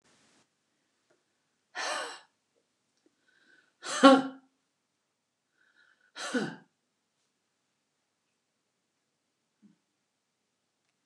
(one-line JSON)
{"exhalation_length": "11.1 s", "exhalation_amplitude": 21586, "exhalation_signal_mean_std_ratio": 0.17, "survey_phase": "beta (2021-08-13 to 2022-03-07)", "age": "65+", "gender": "Female", "wearing_mask": "No", "symptom_none": true, "smoker_status": "Ex-smoker", "respiratory_condition_asthma": false, "respiratory_condition_other": false, "recruitment_source": "REACT", "submission_delay": "2 days", "covid_test_result": "Negative", "covid_test_method": "RT-qPCR", "influenza_a_test_result": "Negative", "influenza_b_test_result": "Negative"}